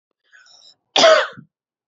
{"cough_length": "1.9 s", "cough_amplitude": 28040, "cough_signal_mean_std_ratio": 0.33, "survey_phase": "beta (2021-08-13 to 2022-03-07)", "age": "18-44", "gender": "Female", "wearing_mask": "No", "symptom_cough_any": true, "symptom_runny_or_blocked_nose": true, "symptom_fever_high_temperature": true, "symptom_other": true, "symptom_onset": "3 days", "smoker_status": "Never smoked", "respiratory_condition_asthma": false, "respiratory_condition_other": false, "recruitment_source": "Test and Trace", "submission_delay": "1 day", "covid_test_result": "Positive", "covid_test_method": "RT-qPCR", "covid_ct_value": 35.9, "covid_ct_gene": "N gene"}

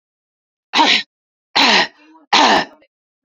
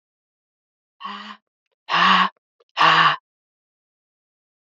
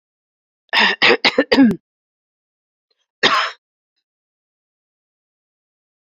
{"three_cough_length": "3.2 s", "three_cough_amplitude": 31892, "three_cough_signal_mean_std_ratio": 0.45, "exhalation_length": "4.8 s", "exhalation_amplitude": 27410, "exhalation_signal_mean_std_ratio": 0.34, "cough_length": "6.1 s", "cough_amplitude": 30202, "cough_signal_mean_std_ratio": 0.32, "survey_phase": "beta (2021-08-13 to 2022-03-07)", "age": "18-44", "gender": "Female", "wearing_mask": "No", "symptom_cough_any": true, "symptom_runny_or_blocked_nose": true, "symptom_fatigue": true, "symptom_headache": true, "symptom_other": true, "symptom_onset": "3 days", "smoker_status": "Ex-smoker", "respiratory_condition_asthma": false, "respiratory_condition_other": false, "recruitment_source": "Test and Trace", "submission_delay": "2 days", "covid_test_result": "Positive", "covid_test_method": "RT-qPCR", "covid_ct_value": 35.1, "covid_ct_gene": "N gene"}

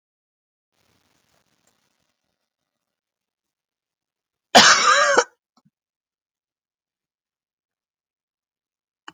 {"cough_length": "9.1 s", "cough_amplitude": 31487, "cough_signal_mean_std_ratio": 0.21, "survey_phase": "alpha (2021-03-01 to 2021-08-12)", "age": "65+", "gender": "Female", "wearing_mask": "No", "symptom_none": true, "smoker_status": "Ex-smoker", "respiratory_condition_asthma": false, "respiratory_condition_other": false, "recruitment_source": "REACT", "submission_delay": "1 day", "covid_test_result": "Negative", "covid_test_method": "RT-qPCR"}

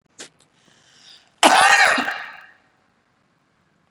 {"cough_length": "3.9 s", "cough_amplitude": 32767, "cough_signal_mean_std_ratio": 0.34, "survey_phase": "beta (2021-08-13 to 2022-03-07)", "age": "18-44", "gender": "Female", "wearing_mask": "No", "symptom_none": true, "smoker_status": "Never smoked", "respiratory_condition_asthma": false, "respiratory_condition_other": false, "recruitment_source": "REACT", "submission_delay": "1 day", "covid_test_result": "Negative", "covid_test_method": "RT-qPCR"}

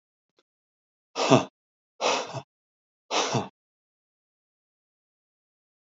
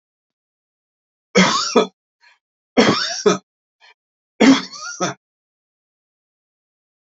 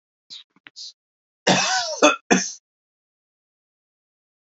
{"exhalation_length": "6.0 s", "exhalation_amplitude": 26709, "exhalation_signal_mean_std_ratio": 0.27, "three_cough_length": "7.2 s", "three_cough_amplitude": 32768, "three_cough_signal_mean_std_ratio": 0.32, "cough_length": "4.5 s", "cough_amplitude": 29817, "cough_signal_mean_std_ratio": 0.32, "survey_phase": "alpha (2021-03-01 to 2021-08-12)", "age": "45-64", "gender": "Male", "wearing_mask": "No", "symptom_none": true, "smoker_status": "Ex-smoker", "respiratory_condition_asthma": false, "respiratory_condition_other": false, "recruitment_source": "REACT", "submission_delay": "2 days", "covid_test_result": "Negative", "covid_test_method": "RT-qPCR"}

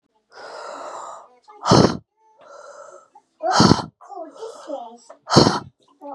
{"exhalation_length": "6.1 s", "exhalation_amplitude": 32767, "exhalation_signal_mean_std_ratio": 0.36, "survey_phase": "beta (2021-08-13 to 2022-03-07)", "age": "18-44", "gender": "Female", "wearing_mask": "No", "symptom_cough_any": true, "symptom_runny_or_blocked_nose": true, "symptom_sore_throat": true, "symptom_fatigue": true, "symptom_fever_high_temperature": true, "symptom_headache": true, "symptom_onset": "2 days", "smoker_status": "Never smoked", "respiratory_condition_asthma": false, "respiratory_condition_other": false, "recruitment_source": "Test and Trace", "submission_delay": "1 day", "covid_test_result": "Positive", "covid_test_method": "ePCR"}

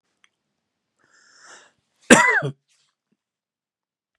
{"cough_length": "4.2 s", "cough_amplitude": 32768, "cough_signal_mean_std_ratio": 0.21, "survey_phase": "beta (2021-08-13 to 2022-03-07)", "age": "65+", "gender": "Male", "wearing_mask": "No", "symptom_cough_any": true, "symptom_onset": "6 days", "smoker_status": "Never smoked", "respiratory_condition_asthma": false, "respiratory_condition_other": false, "recruitment_source": "REACT", "submission_delay": "1 day", "covid_test_result": "Positive", "covid_test_method": "RT-qPCR", "covid_ct_value": 22.5, "covid_ct_gene": "E gene", "influenza_a_test_result": "Negative", "influenza_b_test_result": "Negative"}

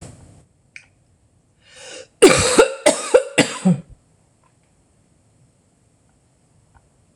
{"cough_length": "7.2 s", "cough_amplitude": 26028, "cough_signal_mean_std_ratio": 0.29, "survey_phase": "beta (2021-08-13 to 2022-03-07)", "age": "45-64", "gender": "Female", "wearing_mask": "No", "symptom_cough_any": true, "symptom_runny_or_blocked_nose": true, "symptom_onset": "11 days", "smoker_status": "Never smoked", "respiratory_condition_asthma": false, "respiratory_condition_other": false, "recruitment_source": "REACT", "submission_delay": "3 days", "covid_test_result": "Negative", "covid_test_method": "RT-qPCR", "influenza_a_test_result": "Negative", "influenza_b_test_result": "Negative"}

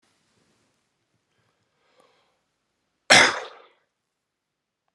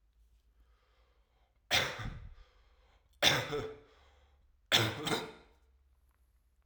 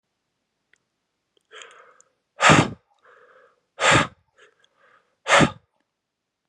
{"cough_length": "4.9 s", "cough_amplitude": 32767, "cough_signal_mean_std_ratio": 0.17, "three_cough_length": "6.7 s", "three_cough_amplitude": 9010, "three_cough_signal_mean_std_ratio": 0.35, "exhalation_length": "6.5 s", "exhalation_amplitude": 29045, "exhalation_signal_mean_std_ratio": 0.27, "survey_phase": "alpha (2021-03-01 to 2021-08-12)", "age": "18-44", "gender": "Male", "wearing_mask": "No", "symptom_cough_any": true, "symptom_change_to_sense_of_smell_or_taste": true, "symptom_onset": "2 days", "smoker_status": "Never smoked", "respiratory_condition_asthma": false, "respiratory_condition_other": false, "recruitment_source": "Test and Trace", "submission_delay": "2 days", "covid_test_result": "Positive", "covid_test_method": "RT-qPCR", "covid_ct_value": 21.1, "covid_ct_gene": "ORF1ab gene"}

